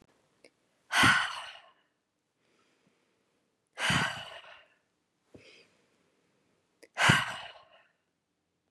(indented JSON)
{
  "exhalation_length": "8.7 s",
  "exhalation_amplitude": 12977,
  "exhalation_signal_mean_std_ratio": 0.29,
  "survey_phase": "beta (2021-08-13 to 2022-03-07)",
  "age": "45-64",
  "gender": "Female",
  "wearing_mask": "No",
  "symptom_none": true,
  "smoker_status": "Ex-smoker",
  "respiratory_condition_asthma": false,
  "respiratory_condition_other": false,
  "recruitment_source": "REACT",
  "submission_delay": "2 days",
  "covid_test_result": "Negative",
  "covid_test_method": "RT-qPCR",
  "influenza_a_test_result": "Negative",
  "influenza_b_test_result": "Negative"
}